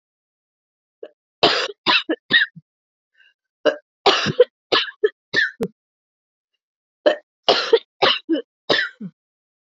{"three_cough_length": "9.7 s", "three_cough_amplitude": 30146, "three_cough_signal_mean_std_ratio": 0.37, "survey_phase": "beta (2021-08-13 to 2022-03-07)", "age": "45-64", "gender": "Female", "wearing_mask": "No", "symptom_cough_any": true, "symptom_new_continuous_cough": true, "symptom_runny_or_blocked_nose": true, "symptom_shortness_of_breath": true, "symptom_sore_throat": true, "symptom_abdominal_pain": true, "symptom_diarrhoea": true, "symptom_fatigue": true, "symptom_fever_high_temperature": true, "symptom_headache": true, "symptom_change_to_sense_of_smell_or_taste": true, "symptom_loss_of_taste": true, "symptom_onset": "5 days", "smoker_status": "Ex-smoker", "respiratory_condition_asthma": true, "respiratory_condition_other": false, "recruitment_source": "Test and Trace", "submission_delay": "2 days", "covid_test_result": "Positive", "covid_test_method": "RT-qPCR", "covid_ct_value": 18.7, "covid_ct_gene": "ORF1ab gene", "covid_ct_mean": 19.7, "covid_viral_load": "350000 copies/ml", "covid_viral_load_category": "Low viral load (10K-1M copies/ml)"}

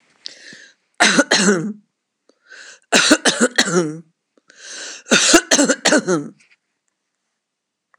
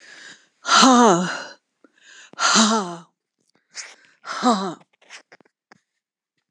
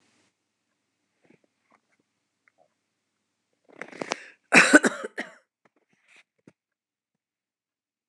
{"three_cough_length": "8.0 s", "three_cough_amplitude": 26028, "three_cough_signal_mean_std_ratio": 0.44, "exhalation_length": "6.5 s", "exhalation_amplitude": 26028, "exhalation_signal_mean_std_ratio": 0.4, "cough_length": "8.1 s", "cough_amplitude": 26028, "cough_signal_mean_std_ratio": 0.17, "survey_phase": "beta (2021-08-13 to 2022-03-07)", "age": "65+", "gender": "Female", "wearing_mask": "No", "symptom_none": true, "smoker_status": "Never smoked", "respiratory_condition_asthma": false, "respiratory_condition_other": false, "recruitment_source": "REACT", "submission_delay": "1 day", "covid_test_result": "Negative", "covid_test_method": "RT-qPCR"}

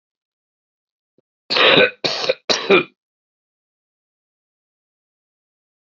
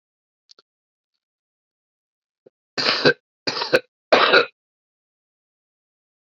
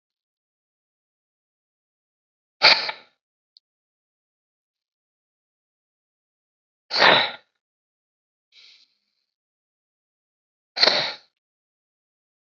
{"cough_length": "5.8 s", "cough_amplitude": 32768, "cough_signal_mean_std_ratio": 0.29, "three_cough_length": "6.2 s", "three_cough_amplitude": 27874, "three_cough_signal_mean_std_ratio": 0.27, "exhalation_length": "12.5 s", "exhalation_amplitude": 29478, "exhalation_signal_mean_std_ratio": 0.19, "survey_phase": "alpha (2021-03-01 to 2021-08-12)", "age": "65+", "gender": "Male", "wearing_mask": "No", "symptom_none": true, "smoker_status": "Current smoker (1 to 10 cigarettes per day)", "respiratory_condition_asthma": false, "respiratory_condition_other": false, "recruitment_source": "REACT", "submission_delay": "1 day", "covid_test_result": "Negative", "covid_test_method": "RT-qPCR"}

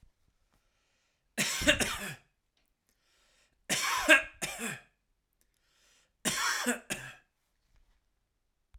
{"three_cough_length": "8.8 s", "three_cough_amplitude": 13553, "three_cough_signal_mean_std_ratio": 0.34, "survey_phase": "alpha (2021-03-01 to 2021-08-12)", "age": "18-44", "gender": "Male", "wearing_mask": "No", "symptom_none": true, "smoker_status": "Never smoked", "respiratory_condition_asthma": false, "respiratory_condition_other": false, "recruitment_source": "REACT", "submission_delay": "1 day", "covid_test_result": "Negative", "covid_test_method": "RT-qPCR"}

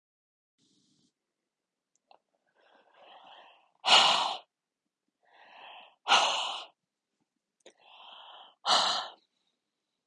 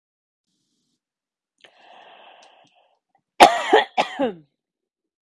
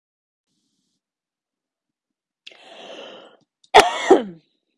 {"exhalation_length": "10.1 s", "exhalation_amplitude": 12292, "exhalation_signal_mean_std_ratio": 0.29, "cough_length": "5.3 s", "cough_amplitude": 32768, "cough_signal_mean_std_ratio": 0.23, "three_cough_length": "4.8 s", "three_cough_amplitude": 32768, "three_cough_signal_mean_std_ratio": 0.21, "survey_phase": "beta (2021-08-13 to 2022-03-07)", "age": "45-64", "gender": "Female", "wearing_mask": "No", "symptom_runny_or_blocked_nose": true, "symptom_diarrhoea": true, "symptom_fatigue": true, "symptom_headache": true, "symptom_other": true, "smoker_status": "Ex-smoker", "respiratory_condition_asthma": false, "respiratory_condition_other": false, "recruitment_source": "Test and Trace", "submission_delay": "2 days", "covid_test_result": "Positive", "covid_test_method": "LFT"}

